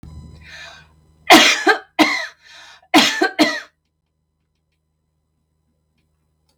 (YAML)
cough_length: 6.6 s
cough_amplitude: 32768
cough_signal_mean_std_ratio: 0.33
survey_phase: beta (2021-08-13 to 2022-03-07)
age: 45-64
gender: Female
wearing_mask: 'No'
symptom_none: true
smoker_status: Never smoked
respiratory_condition_asthma: false
respiratory_condition_other: false
recruitment_source: REACT
submission_delay: 1 day
covid_test_result: Negative
covid_test_method: RT-qPCR
influenza_a_test_result: Negative
influenza_b_test_result: Negative